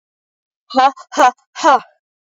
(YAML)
exhalation_length: 2.3 s
exhalation_amplitude: 29859
exhalation_signal_mean_std_ratio: 0.39
survey_phase: beta (2021-08-13 to 2022-03-07)
age: 18-44
gender: Female
wearing_mask: 'No'
symptom_cough_any: true
symptom_runny_or_blocked_nose: true
symptom_shortness_of_breath: true
symptom_abdominal_pain: true
symptom_fatigue: true
symptom_fever_high_temperature: true
symptom_headache: true
symptom_change_to_sense_of_smell_or_taste: true
symptom_loss_of_taste: true
symptom_onset: 4 days
smoker_status: Never smoked
respiratory_condition_asthma: false
respiratory_condition_other: false
recruitment_source: Test and Trace
submission_delay: 2 days
covid_test_result: Positive
covid_test_method: RT-qPCR
covid_ct_value: 21.5
covid_ct_gene: ORF1ab gene
covid_ct_mean: 21.7
covid_viral_load: 79000 copies/ml
covid_viral_load_category: Low viral load (10K-1M copies/ml)